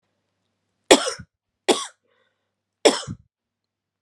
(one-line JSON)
{"three_cough_length": "4.0 s", "three_cough_amplitude": 32767, "three_cough_signal_mean_std_ratio": 0.22, "survey_phase": "beta (2021-08-13 to 2022-03-07)", "age": "18-44", "gender": "Female", "wearing_mask": "No", "symptom_cough_any": true, "symptom_runny_or_blocked_nose": true, "symptom_sore_throat": true, "symptom_fatigue": true, "symptom_fever_high_temperature": true, "symptom_headache": true, "symptom_change_to_sense_of_smell_or_taste": true, "symptom_loss_of_taste": true, "symptom_onset": "6 days", "smoker_status": "Never smoked", "respiratory_condition_asthma": false, "respiratory_condition_other": false, "recruitment_source": "Test and Trace", "submission_delay": "2 days", "covid_test_method": "RT-qPCR", "covid_ct_value": 22.6, "covid_ct_gene": "ORF1ab gene"}